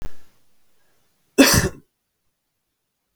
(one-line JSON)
{"cough_length": "3.2 s", "cough_amplitude": 32766, "cough_signal_mean_std_ratio": 0.3, "survey_phase": "beta (2021-08-13 to 2022-03-07)", "age": "18-44", "gender": "Male", "wearing_mask": "No", "symptom_fatigue": true, "symptom_onset": "10 days", "smoker_status": "Current smoker (11 or more cigarettes per day)", "respiratory_condition_asthma": false, "respiratory_condition_other": false, "recruitment_source": "REACT", "submission_delay": "2 days", "covid_test_result": "Negative", "covid_test_method": "RT-qPCR"}